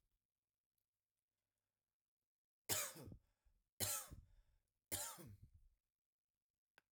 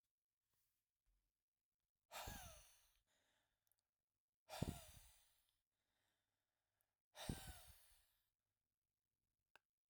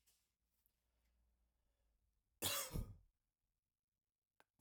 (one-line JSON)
{"three_cough_length": "6.9 s", "three_cough_amplitude": 1524, "three_cough_signal_mean_std_ratio": 0.29, "exhalation_length": "9.9 s", "exhalation_amplitude": 951, "exhalation_signal_mean_std_ratio": 0.26, "cough_length": "4.6 s", "cough_amplitude": 1300, "cough_signal_mean_std_ratio": 0.26, "survey_phase": "alpha (2021-03-01 to 2021-08-12)", "age": "18-44", "gender": "Male", "wearing_mask": "No", "symptom_none": true, "smoker_status": "Never smoked", "respiratory_condition_asthma": false, "respiratory_condition_other": false, "recruitment_source": "REACT", "submission_delay": "8 days", "covid_test_result": "Negative", "covid_test_method": "RT-qPCR"}